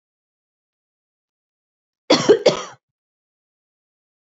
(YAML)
cough_length: 4.4 s
cough_amplitude: 32767
cough_signal_mean_std_ratio: 0.22
survey_phase: beta (2021-08-13 to 2022-03-07)
age: 18-44
gender: Female
wearing_mask: 'No'
symptom_none: true
smoker_status: Never smoked
respiratory_condition_asthma: false
respiratory_condition_other: false
recruitment_source: REACT
submission_delay: 3 days
covid_test_result: Negative
covid_test_method: RT-qPCR
influenza_a_test_result: Unknown/Void
influenza_b_test_result: Unknown/Void